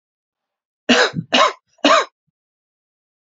{
  "three_cough_length": "3.2 s",
  "three_cough_amplitude": 28438,
  "three_cough_signal_mean_std_ratio": 0.36,
  "survey_phase": "beta (2021-08-13 to 2022-03-07)",
  "age": "18-44",
  "gender": "Female",
  "wearing_mask": "No",
  "symptom_runny_or_blocked_nose": true,
  "symptom_sore_throat": true,
  "symptom_fatigue": true,
  "symptom_fever_high_temperature": true,
  "symptom_headache": true,
  "smoker_status": "Never smoked",
  "respiratory_condition_asthma": false,
  "respiratory_condition_other": false,
  "recruitment_source": "Test and Trace",
  "submission_delay": "-1 day",
  "covid_test_result": "Positive",
  "covid_test_method": "LFT"
}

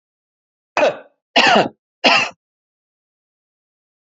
{
  "three_cough_length": "4.0 s",
  "three_cough_amplitude": 32768,
  "three_cough_signal_mean_std_ratio": 0.34,
  "survey_phase": "alpha (2021-03-01 to 2021-08-12)",
  "age": "45-64",
  "gender": "Male",
  "wearing_mask": "No",
  "symptom_none": true,
  "smoker_status": "Never smoked",
  "respiratory_condition_asthma": false,
  "respiratory_condition_other": false,
  "recruitment_source": "REACT",
  "submission_delay": "2 days",
  "covid_test_result": "Negative",
  "covid_test_method": "RT-qPCR"
}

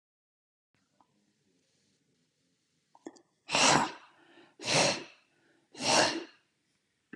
{
  "exhalation_length": "7.2 s",
  "exhalation_amplitude": 10277,
  "exhalation_signal_mean_std_ratio": 0.32,
  "survey_phase": "alpha (2021-03-01 to 2021-08-12)",
  "age": "45-64",
  "gender": "Male",
  "wearing_mask": "No",
  "symptom_none": true,
  "smoker_status": "Never smoked",
  "respiratory_condition_asthma": false,
  "respiratory_condition_other": false,
  "recruitment_source": "REACT",
  "submission_delay": "3 days",
  "covid_test_result": "Negative",
  "covid_test_method": "RT-qPCR"
}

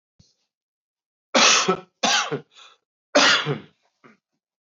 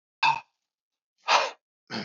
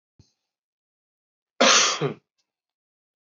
{
  "three_cough_length": "4.6 s",
  "three_cough_amplitude": 20951,
  "three_cough_signal_mean_std_ratio": 0.39,
  "exhalation_length": "2.0 s",
  "exhalation_amplitude": 17849,
  "exhalation_signal_mean_std_ratio": 0.36,
  "cough_length": "3.2 s",
  "cough_amplitude": 20752,
  "cough_signal_mean_std_ratio": 0.29,
  "survey_phase": "beta (2021-08-13 to 2022-03-07)",
  "age": "45-64",
  "gender": "Male",
  "wearing_mask": "No",
  "symptom_none": true,
  "smoker_status": "Ex-smoker",
  "respiratory_condition_asthma": false,
  "respiratory_condition_other": false,
  "recruitment_source": "REACT",
  "submission_delay": "3 days",
  "covid_test_result": "Negative",
  "covid_test_method": "RT-qPCR",
  "influenza_a_test_result": "Negative",
  "influenza_b_test_result": "Negative"
}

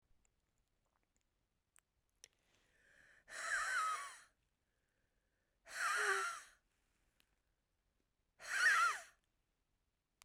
{
  "exhalation_length": "10.2 s",
  "exhalation_amplitude": 2204,
  "exhalation_signal_mean_std_ratio": 0.35,
  "survey_phase": "beta (2021-08-13 to 2022-03-07)",
  "age": "45-64",
  "gender": "Female",
  "wearing_mask": "No",
  "symptom_cough_any": true,
  "symptom_runny_or_blocked_nose": true,
  "symptom_fatigue": true,
  "symptom_other": true,
  "smoker_status": "Ex-smoker",
  "respiratory_condition_asthma": true,
  "respiratory_condition_other": false,
  "recruitment_source": "Test and Trace",
  "submission_delay": "1 day",
  "covid_test_result": "Positive",
  "covid_test_method": "LFT"
}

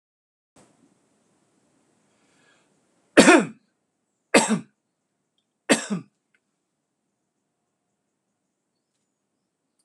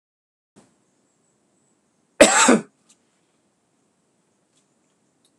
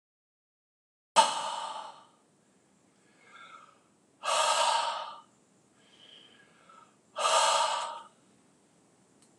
{
  "three_cough_length": "9.8 s",
  "three_cough_amplitude": 26028,
  "three_cough_signal_mean_std_ratio": 0.19,
  "cough_length": "5.4 s",
  "cough_amplitude": 26028,
  "cough_signal_mean_std_ratio": 0.2,
  "exhalation_length": "9.4 s",
  "exhalation_amplitude": 13031,
  "exhalation_signal_mean_std_ratio": 0.39,
  "survey_phase": "beta (2021-08-13 to 2022-03-07)",
  "age": "65+",
  "gender": "Male",
  "wearing_mask": "No",
  "symptom_none": true,
  "smoker_status": "Never smoked",
  "respiratory_condition_asthma": false,
  "respiratory_condition_other": false,
  "recruitment_source": "REACT",
  "submission_delay": "3 days",
  "covid_test_result": "Negative",
  "covid_test_method": "RT-qPCR"
}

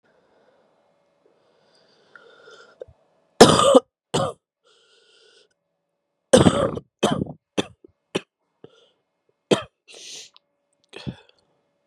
{
  "three_cough_length": "11.9 s",
  "three_cough_amplitude": 32768,
  "three_cough_signal_mean_std_ratio": 0.24,
  "survey_phase": "beta (2021-08-13 to 2022-03-07)",
  "age": "18-44",
  "gender": "Female",
  "wearing_mask": "No",
  "symptom_cough_any": true,
  "symptom_shortness_of_breath": true,
  "symptom_sore_throat": true,
  "symptom_abdominal_pain": true,
  "symptom_fatigue": true,
  "symptom_fever_high_temperature": true,
  "symptom_headache": true,
  "symptom_change_to_sense_of_smell_or_taste": true,
  "symptom_other": true,
  "symptom_onset": "2 days",
  "smoker_status": "Current smoker (1 to 10 cigarettes per day)",
  "respiratory_condition_asthma": false,
  "respiratory_condition_other": false,
  "recruitment_source": "Test and Trace",
  "submission_delay": "1 day",
  "covid_test_result": "Positive",
  "covid_test_method": "RT-qPCR",
  "covid_ct_value": 15.7,
  "covid_ct_gene": "ORF1ab gene"
}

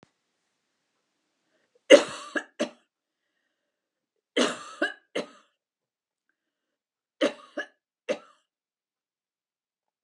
{
  "three_cough_length": "10.0 s",
  "three_cough_amplitude": 29783,
  "three_cough_signal_mean_std_ratio": 0.18,
  "survey_phase": "alpha (2021-03-01 to 2021-08-12)",
  "age": "65+",
  "gender": "Female",
  "wearing_mask": "No",
  "symptom_none": true,
  "smoker_status": "Never smoked",
  "respiratory_condition_asthma": false,
  "respiratory_condition_other": false,
  "recruitment_source": "REACT",
  "submission_delay": "1 day",
  "covid_test_result": "Negative",
  "covid_test_method": "RT-qPCR"
}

